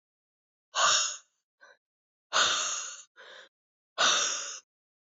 {"exhalation_length": "5.0 s", "exhalation_amplitude": 8122, "exhalation_signal_mean_std_ratio": 0.44, "survey_phase": "beta (2021-08-13 to 2022-03-07)", "age": "18-44", "gender": "Female", "wearing_mask": "No", "symptom_cough_any": true, "symptom_runny_or_blocked_nose": true, "symptom_fatigue": true, "symptom_headache": true, "symptom_change_to_sense_of_smell_or_taste": true, "symptom_loss_of_taste": true, "smoker_status": "Never smoked", "respiratory_condition_asthma": false, "respiratory_condition_other": false, "recruitment_source": "Test and Trace", "submission_delay": "2 days", "covid_test_result": "Positive", "covid_test_method": "RT-qPCR"}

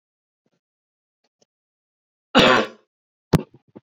{"cough_length": "3.9 s", "cough_amplitude": 27300, "cough_signal_mean_std_ratio": 0.24, "survey_phase": "beta (2021-08-13 to 2022-03-07)", "age": "18-44", "gender": "Male", "wearing_mask": "No", "symptom_none": true, "smoker_status": "Ex-smoker", "respiratory_condition_asthma": false, "respiratory_condition_other": false, "recruitment_source": "REACT", "submission_delay": "1 day", "covid_test_result": "Negative", "covid_test_method": "RT-qPCR", "influenza_a_test_result": "Negative", "influenza_b_test_result": "Negative"}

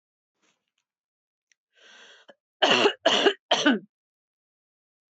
{"cough_length": "5.1 s", "cough_amplitude": 19297, "cough_signal_mean_std_ratio": 0.32, "survey_phase": "beta (2021-08-13 to 2022-03-07)", "age": "45-64", "gender": "Female", "wearing_mask": "No", "symptom_runny_or_blocked_nose": true, "smoker_status": "Never smoked", "respiratory_condition_asthma": false, "respiratory_condition_other": false, "recruitment_source": "REACT", "submission_delay": "1 day", "covid_test_result": "Negative", "covid_test_method": "RT-qPCR", "influenza_a_test_result": "Negative", "influenza_b_test_result": "Negative"}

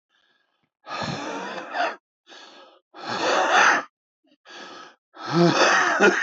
{"exhalation_length": "6.2 s", "exhalation_amplitude": 19278, "exhalation_signal_mean_std_ratio": 0.52, "survey_phase": "alpha (2021-03-01 to 2021-08-12)", "age": "45-64", "gender": "Male", "wearing_mask": "No", "symptom_new_continuous_cough": true, "symptom_fatigue": true, "symptom_fever_high_temperature": true, "symptom_headache": true, "symptom_change_to_sense_of_smell_or_taste": true, "symptom_onset": "3 days", "smoker_status": "Ex-smoker", "respiratory_condition_asthma": true, "respiratory_condition_other": false, "recruitment_source": "Test and Trace", "submission_delay": "2 days", "covid_test_result": "Positive", "covid_test_method": "RT-qPCR", "covid_ct_value": 16.4, "covid_ct_gene": "ORF1ab gene", "covid_ct_mean": 17.1, "covid_viral_load": "2500000 copies/ml", "covid_viral_load_category": "High viral load (>1M copies/ml)"}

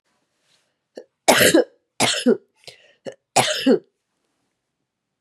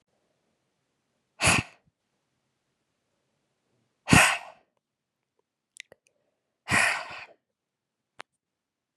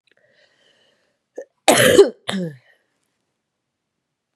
{"three_cough_length": "5.2 s", "three_cough_amplitude": 32203, "three_cough_signal_mean_std_ratio": 0.35, "exhalation_length": "9.0 s", "exhalation_amplitude": 24793, "exhalation_signal_mean_std_ratio": 0.23, "cough_length": "4.4 s", "cough_amplitude": 32767, "cough_signal_mean_std_ratio": 0.27, "survey_phase": "beta (2021-08-13 to 2022-03-07)", "age": "18-44", "gender": "Female", "wearing_mask": "No", "symptom_cough_any": true, "symptom_new_continuous_cough": true, "symptom_runny_or_blocked_nose": true, "symptom_sore_throat": true, "symptom_fatigue": true, "symptom_headache": true, "symptom_onset": "4 days", "smoker_status": "Never smoked", "respiratory_condition_asthma": false, "respiratory_condition_other": false, "recruitment_source": "Test and Trace", "submission_delay": "2 days", "covid_test_result": "Positive", "covid_test_method": "RT-qPCR", "covid_ct_value": 16.2, "covid_ct_gene": "ORF1ab gene", "covid_ct_mean": 16.4, "covid_viral_load": "4300000 copies/ml", "covid_viral_load_category": "High viral load (>1M copies/ml)"}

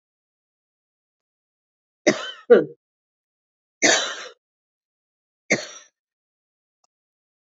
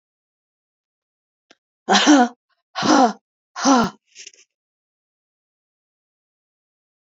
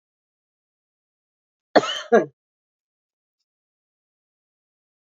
{"three_cough_length": "7.6 s", "three_cough_amplitude": 26033, "three_cough_signal_mean_std_ratio": 0.22, "exhalation_length": "7.1 s", "exhalation_amplitude": 29817, "exhalation_signal_mean_std_ratio": 0.3, "cough_length": "5.1 s", "cough_amplitude": 27791, "cough_signal_mean_std_ratio": 0.16, "survey_phase": "beta (2021-08-13 to 2022-03-07)", "age": "45-64", "gender": "Female", "wearing_mask": "No", "symptom_runny_or_blocked_nose": true, "symptom_sore_throat": true, "symptom_fatigue": true, "symptom_change_to_sense_of_smell_or_taste": true, "symptom_onset": "2 days", "smoker_status": "Never smoked", "respiratory_condition_asthma": false, "respiratory_condition_other": false, "recruitment_source": "Test and Trace", "submission_delay": "2 days", "covid_test_result": "Positive", "covid_test_method": "RT-qPCR", "covid_ct_value": 27.4, "covid_ct_gene": "ORF1ab gene", "covid_ct_mean": 27.6, "covid_viral_load": "900 copies/ml", "covid_viral_load_category": "Minimal viral load (< 10K copies/ml)"}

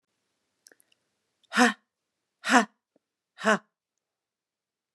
{"exhalation_length": "4.9 s", "exhalation_amplitude": 23398, "exhalation_signal_mean_std_ratio": 0.22, "survey_phase": "beta (2021-08-13 to 2022-03-07)", "age": "65+", "gender": "Female", "wearing_mask": "No", "symptom_none": true, "smoker_status": "Ex-smoker", "respiratory_condition_asthma": false, "respiratory_condition_other": false, "recruitment_source": "REACT", "submission_delay": "1 day", "covid_test_result": "Negative", "covid_test_method": "RT-qPCR", "influenza_a_test_result": "Negative", "influenza_b_test_result": "Negative"}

